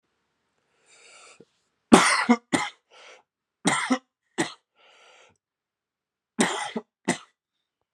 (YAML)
three_cough_length: 7.9 s
three_cough_amplitude: 32767
three_cough_signal_mean_std_ratio: 0.28
survey_phase: alpha (2021-03-01 to 2021-08-12)
age: 18-44
gender: Male
wearing_mask: 'No'
symptom_cough_any: true
symptom_shortness_of_breath: true
symptom_fatigue: true
symptom_headache: true
symptom_change_to_sense_of_smell_or_taste: true
symptom_loss_of_taste: true
symptom_onset: 3 days
smoker_status: Never smoked
respiratory_condition_asthma: false
respiratory_condition_other: false
recruitment_source: Test and Trace
submission_delay: 2 days
covid_test_result: Positive
covid_test_method: RT-qPCR
covid_ct_value: 15.1
covid_ct_gene: ORF1ab gene
covid_ct_mean: 15.4
covid_viral_load: 8600000 copies/ml
covid_viral_load_category: High viral load (>1M copies/ml)